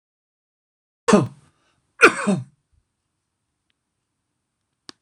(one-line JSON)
{"cough_length": "5.0 s", "cough_amplitude": 26028, "cough_signal_mean_std_ratio": 0.22, "survey_phase": "alpha (2021-03-01 to 2021-08-12)", "age": "45-64", "gender": "Male", "wearing_mask": "No", "symptom_none": true, "smoker_status": "Never smoked", "respiratory_condition_asthma": false, "respiratory_condition_other": false, "recruitment_source": "REACT", "submission_delay": "1 day", "covid_test_result": "Negative", "covid_test_method": "RT-qPCR"}